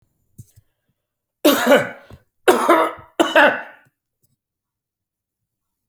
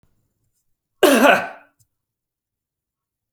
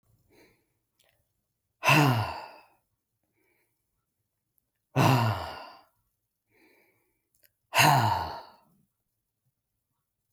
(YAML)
three_cough_length: 5.9 s
three_cough_amplitude: 32768
three_cough_signal_mean_std_ratio: 0.35
cough_length: 3.3 s
cough_amplitude: 31023
cough_signal_mean_std_ratio: 0.28
exhalation_length: 10.3 s
exhalation_amplitude: 14405
exhalation_signal_mean_std_ratio: 0.31
survey_phase: beta (2021-08-13 to 2022-03-07)
age: 45-64
gender: Male
wearing_mask: 'No'
symptom_none: true
smoker_status: Ex-smoker
respiratory_condition_asthma: false
respiratory_condition_other: false
recruitment_source: REACT
submission_delay: 2 days
covid_test_result: Negative
covid_test_method: RT-qPCR
influenza_a_test_result: Negative
influenza_b_test_result: Negative